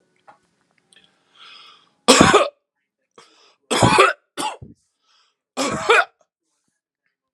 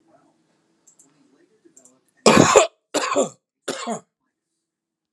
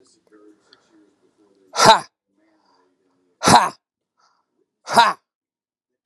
{"three_cough_length": "7.3 s", "three_cough_amplitude": 32768, "three_cough_signal_mean_std_ratio": 0.32, "cough_length": "5.1 s", "cough_amplitude": 32767, "cough_signal_mean_std_ratio": 0.29, "exhalation_length": "6.1 s", "exhalation_amplitude": 32768, "exhalation_signal_mean_std_ratio": 0.25, "survey_phase": "alpha (2021-03-01 to 2021-08-12)", "age": "18-44", "gender": "Male", "wearing_mask": "No", "symptom_none": true, "smoker_status": "Never smoked", "respiratory_condition_asthma": false, "respiratory_condition_other": false, "recruitment_source": "REACT", "submission_delay": "1 day", "covid_test_result": "Negative", "covid_test_method": "RT-qPCR"}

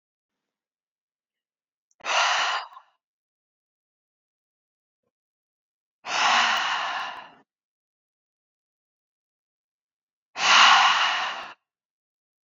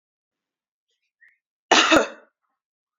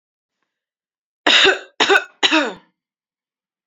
{"exhalation_length": "12.5 s", "exhalation_amplitude": 23452, "exhalation_signal_mean_std_ratio": 0.34, "cough_length": "3.0 s", "cough_amplitude": 28849, "cough_signal_mean_std_ratio": 0.26, "three_cough_length": "3.7 s", "three_cough_amplitude": 32767, "three_cough_signal_mean_std_ratio": 0.36, "survey_phase": "beta (2021-08-13 to 2022-03-07)", "age": "18-44", "gender": "Female", "wearing_mask": "No", "symptom_sore_throat": true, "symptom_fatigue": true, "symptom_headache": true, "smoker_status": "Ex-smoker", "respiratory_condition_asthma": false, "respiratory_condition_other": false, "recruitment_source": "REACT", "submission_delay": "1 day", "covid_test_result": "Negative", "covid_test_method": "RT-qPCR"}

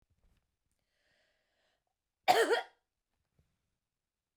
{"cough_length": "4.4 s", "cough_amplitude": 9021, "cough_signal_mean_std_ratio": 0.21, "survey_phase": "beta (2021-08-13 to 2022-03-07)", "age": "65+", "gender": "Female", "wearing_mask": "No", "symptom_headache": true, "smoker_status": "Never smoked", "respiratory_condition_asthma": false, "respiratory_condition_other": false, "recruitment_source": "REACT", "submission_delay": "2 days", "covid_test_result": "Negative", "covid_test_method": "RT-qPCR"}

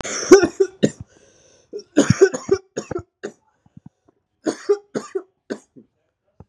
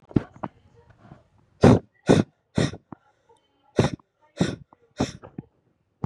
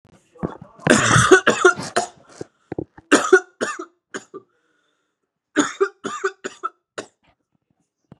{"cough_length": "6.5 s", "cough_amplitude": 32768, "cough_signal_mean_std_ratio": 0.3, "exhalation_length": "6.1 s", "exhalation_amplitude": 29050, "exhalation_signal_mean_std_ratio": 0.27, "three_cough_length": "8.2 s", "three_cough_amplitude": 32767, "three_cough_signal_mean_std_ratio": 0.35, "survey_phase": "beta (2021-08-13 to 2022-03-07)", "age": "18-44", "gender": "Male", "wearing_mask": "Yes", "symptom_cough_any": true, "symptom_new_continuous_cough": true, "symptom_runny_or_blocked_nose": true, "symptom_shortness_of_breath": true, "symptom_fatigue": true, "symptom_headache": true, "symptom_onset": "3 days", "smoker_status": "Never smoked", "respiratory_condition_asthma": false, "respiratory_condition_other": false, "recruitment_source": "Test and Trace", "submission_delay": "1 day", "covid_test_result": "Positive", "covid_test_method": "RT-qPCR", "covid_ct_value": 18.8, "covid_ct_gene": "N gene", "covid_ct_mean": 19.2, "covid_viral_load": "490000 copies/ml", "covid_viral_load_category": "Low viral load (10K-1M copies/ml)"}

